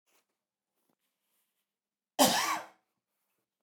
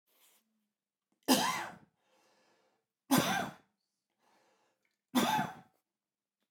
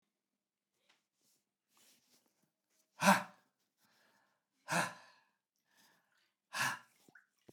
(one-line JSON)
{"cough_length": "3.6 s", "cough_amplitude": 10003, "cough_signal_mean_std_ratio": 0.25, "three_cough_length": "6.5 s", "three_cough_amplitude": 7539, "three_cough_signal_mean_std_ratio": 0.32, "exhalation_length": "7.5 s", "exhalation_amplitude": 6698, "exhalation_signal_mean_std_ratio": 0.21, "survey_phase": "beta (2021-08-13 to 2022-03-07)", "age": "45-64", "gender": "Male", "wearing_mask": "No", "symptom_none": true, "symptom_onset": "5 days", "smoker_status": "Never smoked", "respiratory_condition_asthma": false, "respiratory_condition_other": false, "recruitment_source": "REACT", "submission_delay": "1 day", "covid_test_result": "Negative", "covid_test_method": "RT-qPCR", "influenza_a_test_result": "Negative", "influenza_b_test_result": "Negative"}